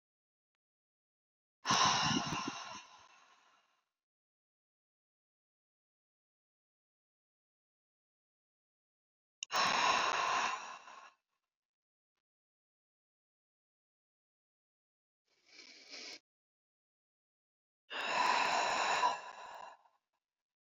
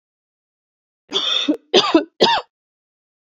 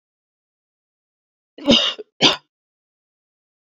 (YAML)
exhalation_length: 20.7 s
exhalation_amplitude: 4075
exhalation_signal_mean_std_ratio: 0.34
three_cough_length: 3.2 s
three_cough_amplitude: 31379
three_cough_signal_mean_std_ratio: 0.4
cough_length: 3.7 s
cough_amplitude: 30565
cough_signal_mean_std_ratio: 0.25
survey_phase: beta (2021-08-13 to 2022-03-07)
age: 18-44
gender: Female
wearing_mask: 'No'
symptom_cough_any: true
symptom_shortness_of_breath: true
symptom_sore_throat: true
symptom_abdominal_pain: true
symptom_fatigue: true
symptom_fever_high_temperature: true
symptom_headache: true
symptom_other: true
symptom_onset: 4 days
smoker_status: Never smoked
respiratory_condition_asthma: false
respiratory_condition_other: false
recruitment_source: Test and Trace
submission_delay: 1 day
covid_test_result: Positive
covid_test_method: RT-qPCR
covid_ct_value: 25.6
covid_ct_gene: N gene